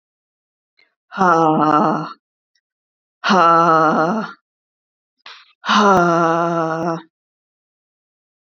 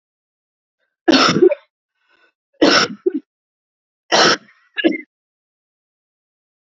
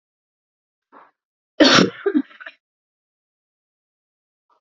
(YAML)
exhalation_length: 8.5 s
exhalation_amplitude: 29319
exhalation_signal_mean_std_ratio: 0.49
three_cough_length: 6.7 s
three_cough_amplitude: 31907
three_cough_signal_mean_std_ratio: 0.33
cough_length: 4.8 s
cough_amplitude: 29551
cough_signal_mean_std_ratio: 0.24
survey_phase: beta (2021-08-13 to 2022-03-07)
age: 45-64
gender: Female
wearing_mask: 'No'
symptom_new_continuous_cough: true
symptom_runny_or_blocked_nose: true
symptom_shortness_of_breath: true
symptom_sore_throat: true
symptom_fatigue: true
symptom_fever_high_temperature: true
symptom_headache: true
symptom_other: true
symptom_onset: 3 days
smoker_status: Never smoked
respiratory_condition_asthma: true
respiratory_condition_other: false
recruitment_source: Test and Trace
submission_delay: 1 day
covid_test_result: Positive
covid_test_method: RT-qPCR
covid_ct_value: 20.7
covid_ct_gene: N gene
covid_ct_mean: 20.9
covid_viral_load: 140000 copies/ml
covid_viral_load_category: Low viral load (10K-1M copies/ml)